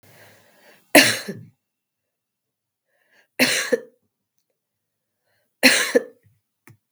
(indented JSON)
{
  "three_cough_length": "6.9 s",
  "three_cough_amplitude": 32768,
  "three_cough_signal_mean_std_ratio": 0.26,
  "survey_phase": "beta (2021-08-13 to 2022-03-07)",
  "age": "45-64",
  "gender": "Female",
  "wearing_mask": "No",
  "symptom_cough_any": true,
  "symptom_runny_or_blocked_nose": true,
  "symptom_sore_throat": true,
  "symptom_onset": "2 days",
  "smoker_status": "Ex-smoker",
  "respiratory_condition_asthma": false,
  "respiratory_condition_other": false,
  "recruitment_source": "Test and Trace",
  "submission_delay": "1 day",
  "covid_test_result": "Negative",
  "covid_test_method": "ePCR"
}